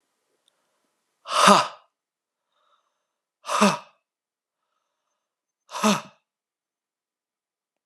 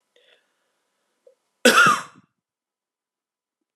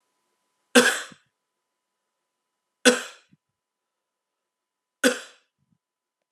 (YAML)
exhalation_length: 7.9 s
exhalation_amplitude: 30240
exhalation_signal_mean_std_ratio: 0.24
cough_length: 3.8 s
cough_amplitude: 32596
cough_signal_mean_std_ratio: 0.24
three_cough_length: 6.3 s
three_cough_amplitude: 31319
three_cough_signal_mean_std_ratio: 0.2
survey_phase: alpha (2021-03-01 to 2021-08-12)
age: 18-44
gender: Male
wearing_mask: 'No'
symptom_fatigue: true
symptom_headache: true
smoker_status: Never smoked
respiratory_condition_asthma: false
respiratory_condition_other: false
recruitment_source: Test and Trace
submission_delay: 2 days
covid_test_result: Positive
covid_test_method: RT-qPCR
covid_ct_value: 19.8
covid_ct_gene: S gene
covid_ct_mean: 20.1
covid_viral_load: 250000 copies/ml
covid_viral_load_category: Low viral load (10K-1M copies/ml)